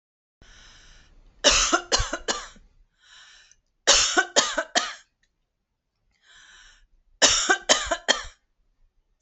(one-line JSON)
{"three_cough_length": "9.2 s", "three_cough_amplitude": 27527, "three_cough_signal_mean_std_ratio": 0.37, "survey_phase": "alpha (2021-03-01 to 2021-08-12)", "age": "45-64", "gender": "Female", "wearing_mask": "No", "symptom_none": true, "smoker_status": "Ex-smoker", "respiratory_condition_asthma": false, "respiratory_condition_other": false, "recruitment_source": "REACT", "submission_delay": "3 days", "covid_test_result": "Negative", "covid_test_method": "RT-qPCR"}